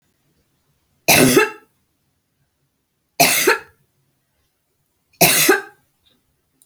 {"three_cough_length": "6.7 s", "three_cough_amplitude": 32768, "three_cough_signal_mean_std_ratio": 0.34, "survey_phase": "beta (2021-08-13 to 2022-03-07)", "age": "65+", "gender": "Female", "wearing_mask": "No", "symptom_none": true, "smoker_status": "Never smoked", "respiratory_condition_asthma": false, "respiratory_condition_other": false, "recruitment_source": "REACT", "submission_delay": "6 days", "covid_test_result": "Negative", "covid_test_method": "RT-qPCR"}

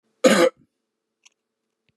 {"cough_length": "2.0 s", "cough_amplitude": 29007, "cough_signal_mean_std_ratio": 0.29, "survey_phase": "beta (2021-08-13 to 2022-03-07)", "age": "45-64", "gender": "Male", "wearing_mask": "No", "symptom_none": true, "smoker_status": "Never smoked", "respiratory_condition_asthma": false, "respiratory_condition_other": false, "recruitment_source": "REACT", "submission_delay": "1 day", "covid_test_result": "Negative", "covid_test_method": "RT-qPCR", "influenza_a_test_result": "Negative", "influenza_b_test_result": "Negative"}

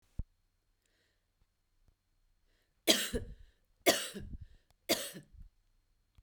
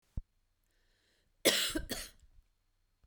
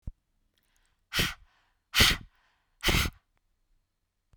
{"three_cough_length": "6.2 s", "three_cough_amplitude": 10693, "three_cough_signal_mean_std_ratio": 0.27, "cough_length": "3.1 s", "cough_amplitude": 8570, "cough_signal_mean_std_ratio": 0.31, "exhalation_length": "4.4 s", "exhalation_amplitude": 18129, "exhalation_signal_mean_std_ratio": 0.3, "survey_phase": "beta (2021-08-13 to 2022-03-07)", "age": "45-64", "gender": "Female", "wearing_mask": "No", "symptom_cough_any": true, "symptom_runny_or_blocked_nose": true, "symptom_sore_throat": true, "symptom_diarrhoea": true, "symptom_fatigue": true, "symptom_headache": true, "symptom_onset": "3 days", "smoker_status": "Never smoked", "respiratory_condition_asthma": false, "respiratory_condition_other": false, "recruitment_source": "Test and Trace", "submission_delay": "2 days", "covid_test_result": "Positive", "covid_test_method": "RT-qPCR", "covid_ct_value": 32.9, "covid_ct_gene": "ORF1ab gene", "covid_ct_mean": 33.9, "covid_viral_load": "7.6 copies/ml", "covid_viral_load_category": "Minimal viral load (< 10K copies/ml)"}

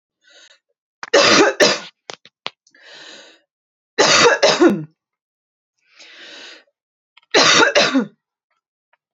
{"three_cough_length": "9.1 s", "three_cough_amplitude": 31879, "three_cough_signal_mean_std_ratio": 0.4, "survey_phase": "beta (2021-08-13 to 2022-03-07)", "age": "18-44", "gender": "Female", "wearing_mask": "No", "symptom_cough_any": true, "symptom_diarrhoea": true, "symptom_fatigue": true, "symptom_headache": true, "symptom_change_to_sense_of_smell_or_taste": true, "symptom_onset": "1 day", "smoker_status": "Never smoked", "respiratory_condition_asthma": false, "respiratory_condition_other": false, "recruitment_source": "Test and Trace", "submission_delay": "0 days", "covid_test_result": "Negative", "covid_test_method": "RT-qPCR"}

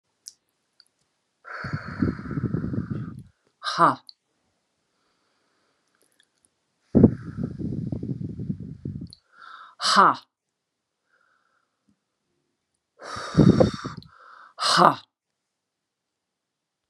{"exhalation_length": "16.9 s", "exhalation_amplitude": 31262, "exhalation_signal_mean_std_ratio": 0.31, "survey_phase": "beta (2021-08-13 to 2022-03-07)", "age": "65+", "gender": "Female", "wearing_mask": "No", "symptom_none": true, "smoker_status": "Current smoker (1 to 10 cigarettes per day)", "respiratory_condition_asthma": false, "respiratory_condition_other": false, "recruitment_source": "REACT", "submission_delay": "0 days", "covid_test_result": "Negative", "covid_test_method": "RT-qPCR"}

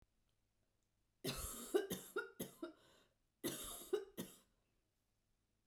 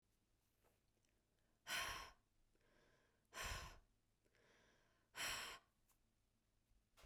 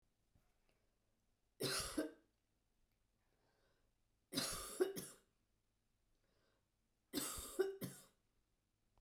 {"cough_length": "5.7 s", "cough_amplitude": 2183, "cough_signal_mean_std_ratio": 0.39, "exhalation_length": "7.1 s", "exhalation_amplitude": 603, "exhalation_signal_mean_std_ratio": 0.37, "three_cough_length": "9.0 s", "three_cough_amplitude": 1942, "three_cough_signal_mean_std_ratio": 0.34, "survey_phase": "beta (2021-08-13 to 2022-03-07)", "age": "45-64", "gender": "Female", "wearing_mask": "No", "symptom_change_to_sense_of_smell_or_taste": true, "symptom_onset": "12 days", "smoker_status": "Never smoked", "respiratory_condition_asthma": false, "respiratory_condition_other": false, "recruitment_source": "REACT", "submission_delay": "2 days", "covid_test_result": "Negative", "covid_test_method": "RT-qPCR"}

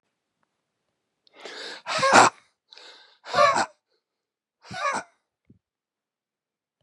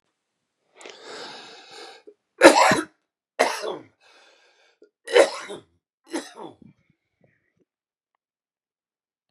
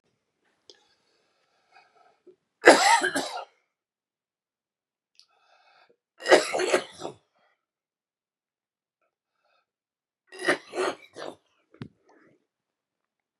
{"exhalation_length": "6.8 s", "exhalation_amplitude": 28181, "exhalation_signal_mean_std_ratio": 0.29, "cough_length": "9.3 s", "cough_amplitude": 32768, "cough_signal_mean_std_ratio": 0.24, "three_cough_length": "13.4 s", "three_cough_amplitude": 32768, "three_cough_signal_mean_std_ratio": 0.23, "survey_phase": "beta (2021-08-13 to 2022-03-07)", "age": "45-64", "gender": "Male", "wearing_mask": "No", "symptom_none": true, "smoker_status": "Ex-smoker", "respiratory_condition_asthma": false, "respiratory_condition_other": false, "recruitment_source": "REACT", "submission_delay": "4 days", "covid_test_result": "Negative", "covid_test_method": "RT-qPCR", "influenza_a_test_result": "Negative", "influenza_b_test_result": "Negative"}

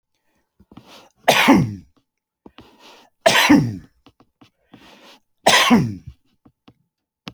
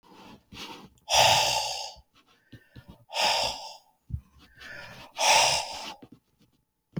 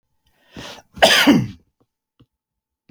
{"three_cough_length": "7.3 s", "three_cough_amplitude": 32767, "three_cough_signal_mean_std_ratio": 0.35, "exhalation_length": "7.0 s", "exhalation_amplitude": 15058, "exhalation_signal_mean_std_ratio": 0.44, "cough_length": "2.9 s", "cough_amplitude": 29878, "cough_signal_mean_std_ratio": 0.33, "survey_phase": "beta (2021-08-13 to 2022-03-07)", "age": "65+", "gender": "Male", "wearing_mask": "No", "symptom_none": true, "smoker_status": "Never smoked", "respiratory_condition_asthma": false, "respiratory_condition_other": false, "recruitment_source": "REACT", "submission_delay": "1 day", "covid_test_result": "Negative", "covid_test_method": "RT-qPCR"}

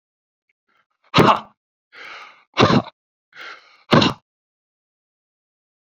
{"exhalation_length": "6.0 s", "exhalation_amplitude": 28659, "exhalation_signal_mean_std_ratio": 0.27, "survey_phase": "beta (2021-08-13 to 2022-03-07)", "age": "45-64", "gender": "Male", "wearing_mask": "No", "symptom_cough_any": true, "symptom_runny_or_blocked_nose": true, "symptom_fatigue": true, "symptom_onset": "2 days", "smoker_status": "Never smoked", "respiratory_condition_asthma": false, "respiratory_condition_other": false, "recruitment_source": "Test and Trace", "submission_delay": "2 days", "covid_test_result": "Positive", "covid_test_method": "RT-qPCR", "covid_ct_value": 19.9, "covid_ct_gene": "N gene", "covid_ct_mean": 21.3, "covid_viral_load": "100000 copies/ml", "covid_viral_load_category": "Low viral load (10K-1M copies/ml)"}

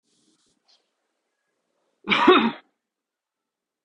{"cough_length": "3.8 s", "cough_amplitude": 24618, "cough_signal_mean_std_ratio": 0.25, "survey_phase": "beta (2021-08-13 to 2022-03-07)", "age": "18-44", "gender": "Male", "wearing_mask": "No", "symptom_cough_any": true, "symptom_runny_or_blocked_nose": true, "smoker_status": "Prefer not to say", "respiratory_condition_asthma": false, "respiratory_condition_other": false, "recruitment_source": "Test and Trace", "submission_delay": "2 days", "covid_test_result": "Positive", "covid_test_method": "RT-qPCR", "covid_ct_value": 17.7, "covid_ct_gene": "ORF1ab gene", "covid_ct_mean": 18.7, "covid_viral_load": "750000 copies/ml", "covid_viral_load_category": "Low viral load (10K-1M copies/ml)"}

